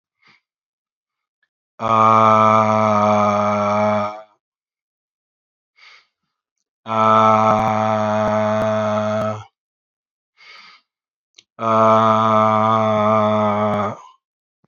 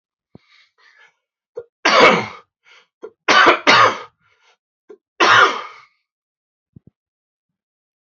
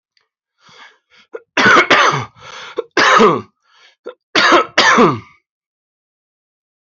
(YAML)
exhalation_length: 14.7 s
exhalation_amplitude: 26505
exhalation_signal_mean_std_ratio: 0.6
three_cough_length: 8.0 s
three_cough_amplitude: 29904
three_cough_signal_mean_std_ratio: 0.34
cough_length: 6.8 s
cough_amplitude: 32767
cough_signal_mean_std_ratio: 0.44
survey_phase: beta (2021-08-13 to 2022-03-07)
age: 45-64
gender: Male
wearing_mask: 'No'
symptom_cough_any: true
symptom_runny_or_blocked_nose: true
symptom_abdominal_pain: true
symptom_fatigue: true
symptom_fever_high_temperature: true
symptom_change_to_sense_of_smell_or_taste: true
symptom_loss_of_taste: true
symptom_onset: 3 days
smoker_status: Never smoked
respiratory_condition_asthma: false
respiratory_condition_other: false
recruitment_source: Test and Trace
submission_delay: 2 days
covid_test_result: Positive
covid_test_method: RT-qPCR